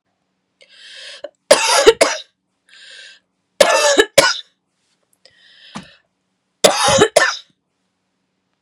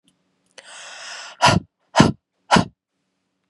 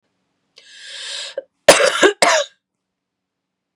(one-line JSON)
{"three_cough_length": "8.6 s", "three_cough_amplitude": 32768, "three_cough_signal_mean_std_ratio": 0.36, "exhalation_length": "3.5 s", "exhalation_amplitude": 32768, "exhalation_signal_mean_std_ratio": 0.3, "cough_length": "3.8 s", "cough_amplitude": 32768, "cough_signal_mean_std_ratio": 0.34, "survey_phase": "beta (2021-08-13 to 2022-03-07)", "age": "18-44", "gender": "Female", "wearing_mask": "No", "symptom_none": true, "smoker_status": "Current smoker (e-cigarettes or vapes only)", "respiratory_condition_asthma": true, "respiratory_condition_other": false, "recruitment_source": "Test and Trace", "submission_delay": "1 day", "covid_test_result": "Negative", "covid_test_method": "RT-qPCR"}